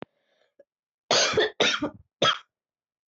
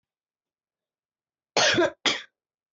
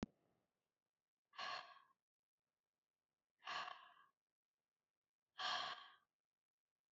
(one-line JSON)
{"three_cough_length": "3.1 s", "three_cough_amplitude": 13760, "three_cough_signal_mean_std_ratio": 0.41, "cough_length": "2.7 s", "cough_amplitude": 14429, "cough_signal_mean_std_ratio": 0.33, "exhalation_length": "6.9 s", "exhalation_amplitude": 1043, "exhalation_signal_mean_std_ratio": 0.31, "survey_phase": "alpha (2021-03-01 to 2021-08-12)", "age": "18-44", "gender": "Female", "wearing_mask": "No", "symptom_cough_any": true, "symptom_new_continuous_cough": true, "symptom_abdominal_pain": true, "symptom_fatigue": true, "symptom_fever_high_temperature": true, "symptom_headache": true, "symptom_onset": "4 days", "smoker_status": "Never smoked", "respiratory_condition_asthma": false, "respiratory_condition_other": false, "recruitment_source": "Test and Trace", "submission_delay": "0 days", "covid_test_result": "Positive", "covid_test_method": "RT-qPCR", "covid_ct_value": 18.8, "covid_ct_gene": "ORF1ab gene"}